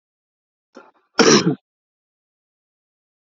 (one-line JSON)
{"cough_length": "3.2 s", "cough_amplitude": 32768, "cough_signal_mean_std_ratio": 0.25, "survey_phase": "alpha (2021-03-01 to 2021-08-12)", "age": "18-44", "gender": "Male", "wearing_mask": "No", "symptom_fatigue": true, "symptom_change_to_sense_of_smell_or_taste": true, "symptom_loss_of_taste": true, "symptom_onset": "6 days", "smoker_status": "Ex-smoker", "respiratory_condition_asthma": false, "respiratory_condition_other": false, "recruitment_source": "Test and Trace", "submission_delay": "3 days", "covid_test_result": "Positive", "covid_test_method": "RT-qPCR", "covid_ct_value": 17.7, "covid_ct_gene": "ORF1ab gene", "covid_ct_mean": 19.0, "covid_viral_load": "600000 copies/ml", "covid_viral_load_category": "Low viral load (10K-1M copies/ml)"}